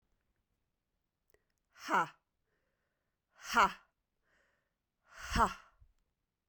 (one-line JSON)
{"exhalation_length": "6.5 s", "exhalation_amplitude": 6160, "exhalation_signal_mean_std_ratio": 0.24, "survey_phase": "beta (2021-08-13 to 2022-03-07)", "age": "45-64", "gender": "Female", "wearing_mask": "No", "symptom_runny_or_blocked_nose": true, "smoker_status": "Never smoked", "respiratory_condition_asthma": false, "respiratory_condition_other": false, "recruitment_source": "REACT", "submission_delay": "2 days", "covid_test_result": "Negative", "covid_test_method": "RT-qPCR", "influenza_a_test_result": "Negative", "influenza_b_test_result": "Negative"}